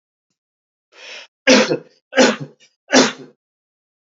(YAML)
three_cough_length: 4.2 s
three_cough_amplitude: 32768
three_cough_signal_mean_std_ratio: 0.33
survey_phase: beta (2021-08-13 to 2022-03-07)
age: 45-64
gender: Male
wearing_mask: 'No'
symptom_none: true
smoker_status: Never smoked
respiratory_condition_asthma: false
respiratory_condition_other: false
recruitment_source: REACT
submission_delay: 13 days
covid_test_result: Negative
covid_test_method: RT-qPCR
influenza_a_test_result: Negative
influenza_b_test_result: Negative